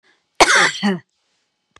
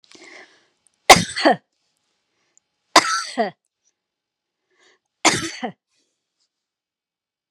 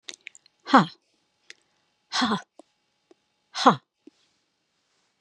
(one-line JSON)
{"cough_length": "1.8 s", "cough_amplitude": 32768, "cough_signal_mean_std_ratio": 0.41, "three_cough_length": "7.5 s", "three_cough_amplitude": 32768, "three_cough_signal_mean_std_ratio": 0.23, "exhalation_length": "5.2 s", "exhalation_amplitude": 30070, "exhalation_signal_mean_std_ratio": 0.22, "survey_phase": "beta (2021-08-13 to 2022-03-07)", "age": "65+", "gender": "Female", "wearing_mask": "No", "symptom_none": true, "smoker_status": "Never smoked", "respiratory_condition_asthma": false, "respiratory_condition_other": false, "recruitment_source": "REACT", "submission_delay": "3 days", "covid_test_result": "Negative", "covid_test_method": "RT-qPCR", "influenza_a_test_result": "Negative", "influenza_b_test_result": "Negative"}